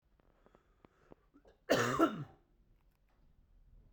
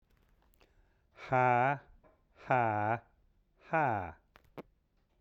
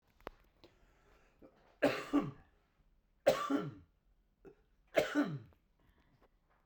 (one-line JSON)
{"cough_length": "3.9 s", "cough_amplitude": 5846, "cough_signal_mean_std_ratio": 0.29, "exhalation_length": "5.2 s", "exhalation_amplitude": 5767, "exhalation_signal_mean_std_ratio": 0.41, "three_cough_length": "6.7 s", "three_cough_amplitude": 5797, "three_cough_signal_mean_std_ratio": 0.33, "survey_phase": "beta (2021-08-13 to 2022-03-07)", "age": "45-64", "gender": "Male", "wearing_mask": "No", "symptom_cough_any": true, "symptom_fatigue": true, "symptom_fever_high_temperature": true, "smoker_status": "Never smoked", "respiratory_condition_asthma": false, "respiratory_condition_other": false, "recruitment_source": "Test and Trace", "submission_delay": "2 days", "covid_test_result": "Positive", "covid_test_method": "RT-qPCR", "covid_ct_value": 26.5, "covid_ct_gene": "ORF1ab gene"}